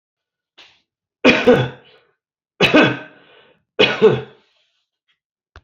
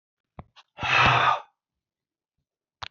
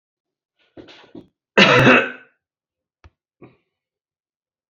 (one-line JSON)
{"three_cough_length": "5.6 s", "three_cough_amplitude": 30290, "three_cough_signal_mean_std_ratio": 0.35, "exhalation_length": "2.9 s", "exhalation_amplitude": 17424, "exhalation_signal_mean_std_ratio": 0.37, "cough_length": "4.7 s", "cough_amplitude": 28591, "cough_signal_mean_std_ratio": 0.27, "survey_phase": "beta (2021-08-13 to 2022-03-07)", "age": "65+", "gender": "Male", "wearing_mask": "Yes", "symptom_runny_or_blocked_nose": true, "symptom_loss_of_taste": true, "symptom_onset": "9 days", "smoker_status": "Ex-smoker", "respiratory_condition_asthma": false, "respiratory_condition_other": false, "recruitment_source": "REACT", "submission_delay": "21 days", "covid_test_result": "Negative", "covid_test_method": "RT-qPCR"}